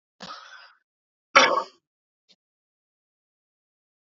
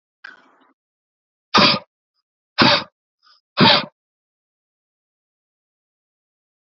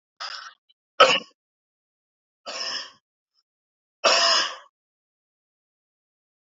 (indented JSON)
{
  "cough_length": "4.2 s",
  "cough_amplitude": 32767,
  "cough_signal_mean_std_ratio": 0.2,
  "exhalation_length": "6.7 s",
  "exhalation_amplitude": 32768,
  "exhalation_signal_mean_std_ratio": 0.26,
  "three_cough_length": "6.5 s",
  "three_cough_amplitude": 28167,
  "three_cough_signal_mean_std_ratio": 0.28,
  "survey_phase": "alpha (2021-03-01 to 2021-08-12)",
  "age": "18-44",
  "gender": "Male",
  "wearing_mask": "No",
  "symptom_none": true,
  "symptom_onset": "12 days",
  "smoker_status": "Never smoked",
  "respiratory_condition_asthma": false,
  "respiratory_condition_other": false,
  "recruitment_source": "REACT",
  "submission_delay": "2 days",
  "covid_test_result": "Negative",
  "covid_test_method": "RT-qPCR"
}